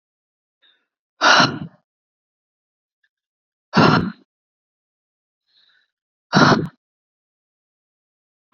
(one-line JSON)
{"exhalation_length": "8.5 s", "exhalation_amplitude": 31881, "exhalation_signal_mean_std_ratio": 0.26, "survey_phase": "beta (2021-08-13 to 2022-03-07)", "age": "18-44", "gender": "Female", "wearing_mask": "No", "symptom_none": true, "smoker_status": "Ex-smoker", "respiratory_condition_asthma": false, "respiratory_condition_other": false, "recruitment_source": "REACT", "submission_delay": "2 days", "covid_test_result": "Negative", "covid_test_method": "RT-qPCR"}